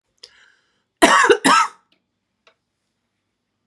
cough_length: 3.7 s
cough_amplitude: 32767
cough_signal_mean_std_ratio: 0.32
survey_phase: beta (2021-08-13 to 2022-03-07)
age: 45-64
gender: Female
wearing_mask: 'No'
symptom_cough_any: true
symptom_change_to_sense_of_smell_or_taste: true
smoker_status: Ex-smoker
respiratory_condition_asthma: false
respiratory_condition_other: false
recruitment_source: REACT
submission_delay: 1 day
covid_test_result: Negative
covid_test_method: RT-qPCR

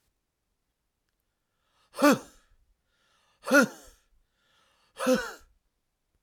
exhalation_length: 6.2 s
exhalation_amplitude: 16053
exhalation_signal_mean_std_ratio: 0.24
survey_phase: alpha (2021-03-01 to 2021-08-12)
age: 45-64
gender: Male
wearing_mask: 'No'
symptom_none: true
smoker_status: Never smoked
respiratory_condition_asthma: false
respiratory_condition_other: false
recruitment_source: REACT
submission_delay: 2 days
covid_test_result: Negative
covid_test_method: RT-qPCR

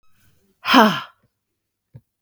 exhalation_length: 2.2 s
exhalation_amplitude: 32768
exhalation_signal_mean_std_ratio: 0.29
survey_phase: beta (2021-08-13 to 2022-03-07)
age: 45-64
gender: Female
wearing_mask: 'No'
symptom_headache: true
symptom_onset: 3 days
smoker_status: Never smoked
respiratory_condition_asthma: false
respiratory_condition_other: false
recruitment_source: Test and Trace
submission_delay: 1 day
covid_test_result: Negative
covid_test_method: ePCR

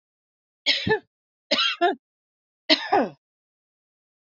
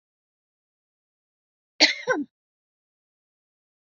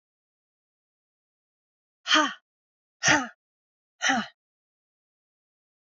three_cough_length: 4.3 s
three_cough_amplitude: 25824
three_cough_signal_mean_std_ratio: 0.37
cough_length: 3.8 s
cough_amplitude: 23679
cough_signal_mean_std_ratio: 0.2
exhalation_length: 6.0 s
exhalation_amplitude: 14345
exhalation_signal_mean_std_ratio: 0.25
survey_phase: beta (2021-08-13 to 2022-03-07)
age: 65+
gender: Female
wearing_mask: 'No'
symptom_none: true
smoker_status: Never smoked
respiratory_condition_asthma: false
respiratory_condition_other: false
recruitment_source: REACT
submission_delay: 7 days
covid_test_result: Negative
covid_test_method: RT-qPCR
influenza_a_test_result: Negative
influenza_b_test_result: Negative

